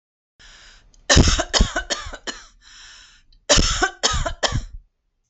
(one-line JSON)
{"cough_length": "5.3 s", "cough_amplitude": 30862, "cough_signal_mean_std_ratio": 0.44, "survey_phase": "alpha (2021-03-01 to 2021-08-12)", "age": "45-64", "gender": "Female", "wearing_mask": "No", "symptom_none": true, "smoker_status": "Ex-smoker", "respiratory_condition_asthma": false, "respiratory_condition_other": false, "recruitment_source": "REACT", "submission_delay": "3 days", "covid_test_result": "Negative", "covid_test_method": "RT-qPCR"}